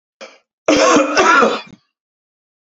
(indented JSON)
{
  "cough_length": "2.7 s",
  "cough_amplitude": 32689,
  "cough_signal_mean_std_ratio": 0.5,
  "survey_phase": "beta (2021-08-13 to 2022-03-07)",
  "age": "45-64",
  "gender": "Male",
  "wearing_mask": "No",
  "symptom_none": true,
  "smoker_status": "Ex-smoker",
  "respiratory_condition_asthma": false,
  "respiratory_condition_other": false,
  "recruitment_source": "REACT",
  "submission_delay": "1 day",
  "covid_test_result": "Negative",
  "covid_test_method": "RT-qPCR",
  "influenza_a_test_result": "Negative",
  "influenza_b_test_result": "Negative"
}